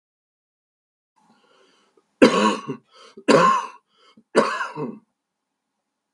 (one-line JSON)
{"three_cough_length": "6.1 s", "three_cough_amplitude": 32768, "three_cough_signal_mean_std_ratio": 0.32, "survey_phase": "beta (2021-08-13 to 2022-03-07)", "age": "65+", "gender": "Male", "wearing_mask": "No", "symptom_cough_any": true, "symptom_runny_or_blocked_nose": true, "symptom_sore_throat": true, "smoker_status": "Ex-smoker", "respiratory_condition_asthma": false, "respiratory_condition_other": false, "recruitment_source": "Test and Trace", "submission_delay": "1 day", "covid_test_result": "Positive", "covid_test_method": "LFT"}